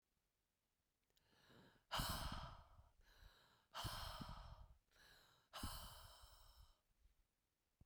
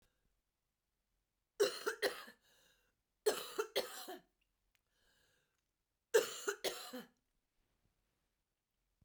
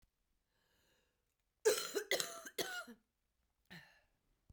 {"exhalation_length": "7.9 s", "exhalation_amplitude": 915, "exhalation_signal_mean_std_ratio": 0.46, "three_cough_length": "9.0 s", "three_cough_amplitude": 3660, "three_cough_signal_mean_std_ratio": 0.28, "cough_length": "4.5 s", "cough_amplitude": 5297, "cough_signal_mean_std_ratio": 0.31, "survey_phase": "beta (2021-08-13 to 2022-03-07)", "age": "45-64", "gender": "Female", "wearing_mask": "No", "symptom_cough_any": true, "symptom_runny_or_blocked_nose": true, "symptom_shortness_of_breath": true, "symptom_fatigue": true, "smoker_status": "Never smoked", "respiratory_condition_asthma": false, "respiratory_condition_other": false, "recruitment_source": "Test and Trace", "submission_delay": "2 days", "covid_test_result": "Positive", "covid_test_method": "RT-qPCR", "covid_ct_value": 38.2, "covid_ct_gene": "N gene"}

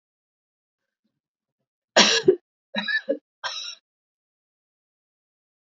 {"three_cough_length": "5.6 s", "three_cough_amplitude": 27219, "three_cough_signal_mean_std_ratio": 0.26, "survey_phase": "beta (2021-08-13 to 2022-03-07)", "age": "18-44", "gender": "Female", "wearing_mask": "No", "symptom_runny_or_blocked_nose": true, "symptom_sore_throat": true, "symptom_other": true, "smoker_status": "Ex-smoker", "respiratory_condition_asthma": false, "respiratory_condition_other": false, "recruitment_source": "Test and Trace", "submission_delay": "2 days", "covid_test_result": "Positive", "covid_test_method": "RT-qPCR", "covid_ct_value": 17.3, "covid_ct_gene": "N gene", "covid_ct_mean": 18.8, "covid_viral_load": "700000 copies/ml", "covid_viral_load_category": "Low viral load (10K-1M copies/ml)"}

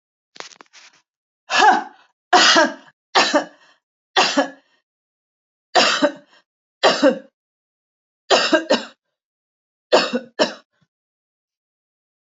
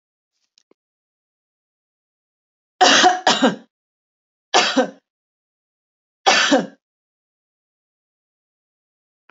{"cough_length": "12.4 s", "cough_amplitude": 29818, "cough_signal_mean_std_ratio": 0.36, "three_cough_length": "9.3 s", "three_cough_amplitude": 32768, "three_cough_signal_mean_std_ratio": 0.29, "survey_phase": "alpha (2021-03-01 to 2021-08-12)", "age": "45-64", "gender": "Female", "wearing_mask": "No", "symptom_none": true, "smoker_status": "Never smoked", "respiratory_condition_asthma": false, "respiratory_condition_other": false, "recruitment_source": "REACT", "submission_delay": "3 days", "covid_test_result": "Negative", "covid_test_method": "RT-qPCR"}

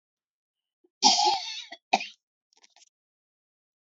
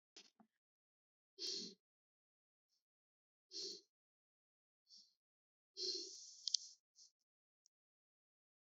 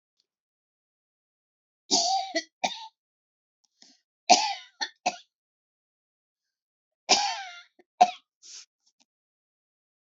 {"cough_length": "3.8 s", "cough_amplitude": 18877, "cough_signal_mean_std_ratio": 0.29, "exhalation_length": "8.6 s", "exhalation_amplitude": 6746, "exhalation_signal_mean_std_ratio": 0.25, "three_cough_length": "10.1 s", "three_cough_amplitude": 23080, "three_cough_signal_mean_std_ratio": 0.25, "survey_phase": "alpha (2021-03-01 to 2021-08-12)", "age": "65+", "gender": "Female", "wearing_mask": "No", "symptom_none": true, "smoker_status": "Ex-smoker", "respiratory_condition_asthma": false, "respiratory_condition_other": true, "recruitment_source": "REACT", "submission_delay": "1 day", "covid_test_result": "Negative", "covid_test_method": "RT-qPCR"}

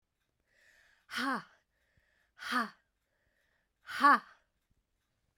{"exhalation_length": "5.4 s", "exhalation_amplitude": 7009, "exhalation_signal_mean_std_ratio": 0.25, "survey_phase": "beta (2021-08-13 to 2022-03-07)", "age": "45-64", "gender": "Female", "wearing_mask": "No", "symptom_cough_any": true, "symptom_runny_or_blocked_nose": true, "symptom_fatigue": true, "symptom_onset": "3 days", "smoker_status": "Never smoked", "respiratory_condition_asthma": true, "respiratory_condition_other": false, "recruitment_source": "Test and Trace", "submission_delay": "2 days", "covid_test_result": "Positive", "covid_test_method": "RT-qPCR"}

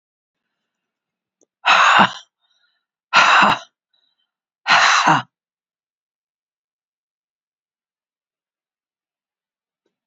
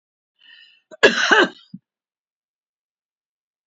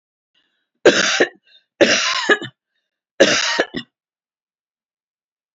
{"exhalation_length": "10.1 s", "exhalation_amplitude": 32768, "exhalation_signal_mean_std_ratio": 0.3, "cough_length": "3.7 s", "cough_amplitude": 28328, "cough_signal_mean_std_ratio": 0.26, "three_cough_length": "5.5 s", "three_cough_amplitude": 31722, "three_cough_signal_mean_std_ratio": 0.38, "survey_phase": "beta (2021-08-13 to 2022-03-07)", "age": "65+", "gender": "Female", "wearing_mask": "No", "symptom_none": true, "smoker_status": "Never smoked", "respiratory_condition_asthma": false, "respiratory_condition_other": false, "recruitment_source": "REACT", "submission_delay": "2 days", "covid_test_result": "Negative", "covid_test_method": "RT-qPCR"}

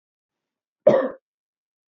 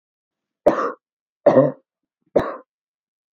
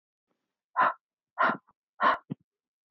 {"cough_length": "1.9 s", "cough_amplitude": 27010, "cough_signal_mean_std_ratio": 0.25, "three_cough_length": "3.3 s", "three_cough_amplitude": 27418, "three_cough_signal_mean_std_ratio": 0.31, "exhalation_length": "2.9 s", "exhalation_amplitude": 8762, "exhalation_signal_mean_std_ratio": 0.33, "survey_phase": "beta (2021-08-13 to 2022-03-07)", "age": "18-44", "gender": "Female", "wearing_mask": "No", "symptom_none": true, "smoker_status": "Ex-smoker", "respiratory_condition_asthma": false, "respiratory_condition_other": false, "recruitment_source": "REACT", "submission_delay": "5 days", "covid_test_result": "Negative", "covid_test_method": "RT-qPCR"}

